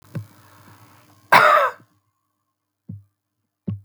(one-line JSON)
{"cough_length": "3.8 s", "cough_amplitude": 32768, "cough_signal_mean_std_ratio": 0.29, "survey_phase": "beta (2021-08-13 to 2022-03-07)", "age": "65+", "gender": "Male", "wearing_mask": "No", "symptom_none": true, "smoker_status": "Never smoked", "respiratory_condition_asthma": false, "respiratory_condition_other": false, "recruitment_source": "REACT", "submission_delay": "1 day", "covid_test_result": "Negative", "covid_test_method": "RT-qPCR"}